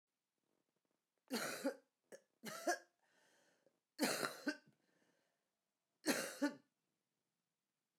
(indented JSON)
{
  "three_cough_length": "8.0 s",
  "three_cough_amplitude": 2415,
  "three_cough_signal_mean_std_ratio": 0.33,
  "survey_phase": "beta (2021-08-13 to 2022-03-07)",
  "age": "45-64",
  "gender": "Female",
  "wearing_mask": "No",
  "symptom_cough_any": true,
  "symptom_runny_or_blocked_nose": true,
  "symptom_sore_throat": true,
  "symptom_fatigue": true,
  "symptom_fever_high_temperature": true,
  "symptom_headache": true,
  "symptom_change_to_sense_of_smell_or_taste": true,
  "symptom_onset": "5 days",
  "smoker_status": "Ex-smoker",
  "respiratory_condition_asthma": false,
  "respiratory_condition_other": false,
  "recruitment_source": "Test and Trace",
  "submission_delay": "1 day",
  "covid_test_result": "Positive",
  "covid_test_method": "RT-qPCR",
  "covid_ct_value": 13.4,
  "covid_ct_gene": "ORF1ab gene",
  "covid_ct_mean": 14.0,
  "covid_viral_load": "26000000 copies/ml",
  "covid_viral_load_category": "High viral load (>1M copies/ml)"
}